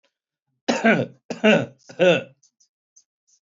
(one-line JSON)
{"three_cough_length": "3.4 s", "three_cough_amplitude": 22193, "three_cough_signal_mean_std_ratio": 0.39, "survey_phase": "beta (2021-08-13 to 2022-03-07)", "age": "45-64", "gender": "Male", "wearing_mask": "No", "symptom_none": true, "smoker_status": "Current smoker (1 to 10 cigarettes per day)", "respiratory_condition_asthma": false, "respiratory_condition_other": false, "recruitment_source": "REACT", "submission_delay": "1 day", "covid_test_result": "Negative", "covid_test_method": "RT-qPCR", "influenza_a_test_result": "Negative", "influenza_b_test_result": "Negative"}